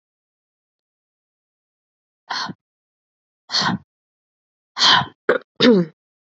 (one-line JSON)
{"exhalation_length": "6.2 s", "exhalation_amplitude": 28065, "exhalation_signal_mean_std_ratio": 0.3, "survey_phase": "beta (2021-08-13 to 2022-03-07)", "age": "18-44", "gender": "Female", "wearing_mask": "No", "symptom_cough_any": true, "symptom_runny_or_blocked_nose": true, "symptom_sore_throat": true, "symptom_fatigue": true, "symptom_headache": true, "symptom_change_to_sense_of_smell_or_taste": true, "symptom_onset": "4 days", "smoker_status": "Current smoker (e-cigarettes or vapes only)", "respiratory_condition_asthma": false, "respiratory_condition_other": false, "recruitment_source": "Test and Trace", "submission_delay": "2 days", "covid_test_result": "Positive", "covid_test_method": "RT-qPCR", "covid_ct_value": 18.3, "covid_ct_gene": "ORF1ab gene", "covid_ct_mean": 18.5, "covid_viral_load": "870000 copies/ml", "covid_viral_load_category": "Low viral load (10K-1M copies/ml)"}